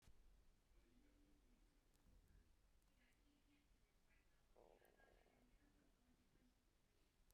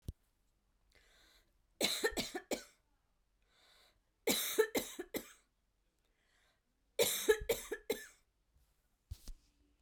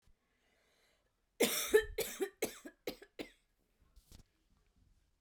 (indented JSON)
{
  "exhalation_length": "7.3 s",
  "exhalation_amplitude": 59,
  "exhalation_signal_mean_std_ratio": 1.01,
  "three_cough_length": "9.8 s",
  "three_cough_amplitude": 4802,
  "three_cough_signal_mean_std_ratio": 0.33,
  "cough_length": "5.2 s",
  "cough_amplitude": 5466,
  "cough_signal_mean_std_ratio": 0.29,
  "survey_phase": "beta (2021-08-13 to 2022-03-07)",
  "age": "18-44",
  "gender": "Female",
  "wearing_mask": "No",
  "symptom_cough_any": true,
  "symptom_runny_or_blocked_nose": true,
  "symptom_shortness_of_breath": true,
  "symptom_headache": true,
  "smoker_status": "Never smoked",
  "respiratory_condition_asthma": true,
  "respiratory_condition_other": false,
  "recruitment_source": "Test and Trace",
  "submission_delay": "2 days",
  "covid_test_result": "Positive",
  "covid_test_method": "RT-qPCR",
  "covid_ct_value": 24.9,
  "covid_ct_gene": "N gene"
}